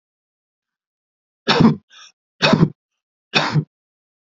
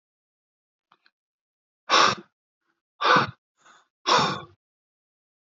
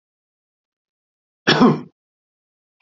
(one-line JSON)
{"three_cough_length": "4.3 s", "three_cough_amplitude": 29945, "three_cough_signal_mean_std_ratio": 0.33, "exhalation_length": "5.5 s", "exhalation_amplitude": 18730, "exhalation_signal_mean_std_ratio": 0.3, "cough_length": "2.8 s", "cough_amplitude": 27856, "cough_signal_mean_std_ratio": 0.26, "survey_phase": "beta (2021-08-13 to 2022-03-07)", "age": "18-44", "gender": "Male", "wearing_mask": "No", "symptom_runny_or_blocked_nose": true, "symptom_shortness_of_breath": true, "symptom_sore_throat": true, "symptom_fatigue": true, "symptom_headache": true, "smoker_status": "Never smoked", "respiratory_condition_asthma": true, "respiratory_condition_other": false, "recruitment_source": "Test and Trace", "submission_delay": "2 days", "covid_test_result": "Positive", "covid_test_method": "LFT"}